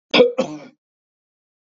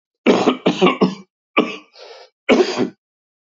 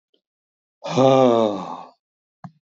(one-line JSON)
{"cough_length": "1.6 s", "cough_amplitude": 27424, "cough_signal_mean_std_ratio": 0.33, "three_cough_length": "3.5 s", "three_cough_amplitude": 30601, "three_cough_signal_mean_std_ratio": 0.47, "exhalation_length": "2.6 s", "exhalation_amplitude": 23726, "exhalation_signal_mean_std_ratio": 0.42, "survey_phase": "beta (2021-08-13 to 2022-03-07)", "age": "65+", "gender": "Male", "wearing_mask": "No", "symptom_none": true, "smoker_status": "Never smoked", "respiratory_condition_asthma": false, "respiratory_condition_other": false, "recruitment_source": "REACT", "submission_delay": "6 days", "covid_test_result": "Negative", "covid_test_method": "RT-qPCR", "influenza_a_test_result": "Negative", "influenza_b_test_result": "Negative"}